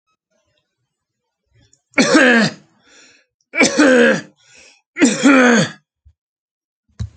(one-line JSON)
{"three_cough_length": "7.2 s", "three_cough_amplitude": 30094, "three_cough_signal_mean_std_ratio": 0.43, "survey_phase": "alpha (2021-03-01 to 2021-08-12)", "age": "65+", "gender": "Male", "wearing_mask": "No", "symptom_none": true, "smoker_status": "Ex-smoker", "respiratory_condition_asthma": false, "respiratory_condition_other": false, "recruitment_source": "REACT", "submission_delay": "2 days", "covid_test_result": "Negative", "covid_test_method": "RT-qPCR"}